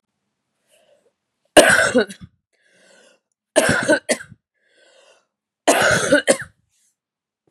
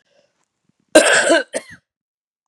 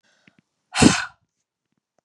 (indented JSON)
{
  "three_cough_length": "7.5 s",
  "three_cough_amplitude": 32768,
  "three_cough_signal_mean_std_ratio": 0.35,
  "cough_length": "2.5 s",
  "cough_amplitude": 32768,
  "cough_signal_mean_std_ratio": 0.35,
  "exhalation_length": "2.0 s",
  "exhalation_amplitude": 32500,
  "exhalation_signal_mean_std_ratio": 0.25,
  "survey_phase": "beta (2021-08-13 to 2022-03-07)",
  "age": "18-44",
  "gender": "Female",
  "wearing_mask": "No",
  "symptom_cough_any": true,
  "symptom_runny_or_blocked_nose": true,
  "symptom_sore_throat": true,
  "symptom_headache": true,
  "symptom_onset": "3 days",
  "smoker_status": "Never smoked",
  "respiratory_condition_asthma": false,
  "respiratory_condition_other": false,
  "recruitment_source": "Test and Trace",
  "submission_delay": "1 day",
  "covid_test_result": "Positive",
  "covid_test_method": "RT-qPCR",
  "covid_ct_value": 33.7,
  "covid_ct_gene": "N gene"
}